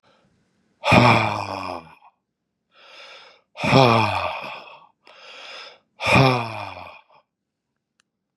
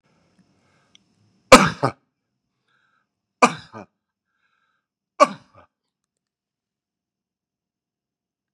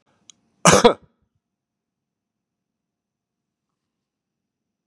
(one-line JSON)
{"exhalation_length": "8.4 s", "exhalation_amplitude": 32036, "exhalation_signal_mean_std_ratio": 0.39, "three_cough_length": "8.5 s", "three_cough_amplitude": 32768, "three_cough_signal_mean_std_ratio": 0.15, "cough_length": "4.9 s", "cough_amplitude": 32767, "cough_signal_mean_std_ratio": 0.17, "survey_phase": "beta (2021-08-13 to 2022-03-07)", "age": "65+", "gender": "Male", "wearing_mask": "No", "symptom_none": true, "smoker_status": "Never smoked", "respiratory_condition_asthma": false, "respiratory_condition_other": false, "recruitment_source": "REACT", "submission_delay": "3 days", "covid_test_result": "Negative", "covid_test_method": "RT-qPCR", "influenza_a_test_result": "Negative", "influenza_b_test_result": "Negative"}